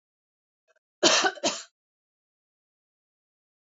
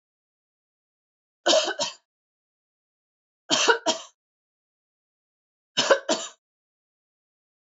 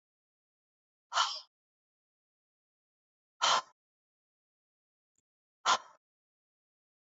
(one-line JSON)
{"cough_length": "3.7 s", "cough_amplitude": 19673, "cough_signal_mean_std_ratio": 0.26, "three_cough_length": "7.7 s", "three_cough_amplitude": 19733, "three_cough_signal_mean_std_ratio": 0.28, "exhalation_length": "7.2 s", "exhalation_amplitude": 6494, "exhalation_signal_mean_std_ratio": 0.21, "survey_phase": "beta (2021-08-13 to 2022-03-07)", "age": "45-64", "gender": "Female", "wearing_mask": "No", "symptom_none": true, "smoker_status": "Never smoked", "respiratory_condition_asthma": false, "respiratory_condition_other": false, "recruitment_source": "Test and Trace", "submission_delay": "0 days", "covid_test_result": "Negative", "covid_test_method": "LFT"}